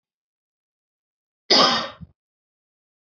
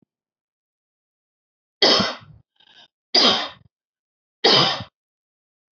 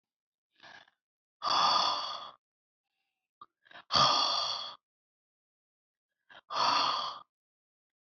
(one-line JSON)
{"cough_length": "3.1 s", "cough_amplitude": 27179, "cough_signal_mean_std_ratio": 0.26, "three_cough_length": "5.7 s", "three_cough_amplitude": 26526, "three_cough_signal_mean_std_ratio": 0.33, "exhalation_length": "8.2 s", "exhalation_amplitude": 8768, "exhalation_signal_mean_std_ratio": 0.41, "survey_phase": "beta (2021-08-13 to 2022-03-07)", "age": "18-44", "gender": "Female", "wearing_mask": "No", "symptom_none": true, "smoker_status": "Never smoked", "respiratory_condition_asthma": false, "respiratory_condition_other": false, "recruitment_source": "REACT", "submission_delay": "1 day", "covid_test_result": "Negative", "covid_test_method": "RT-qPCR"}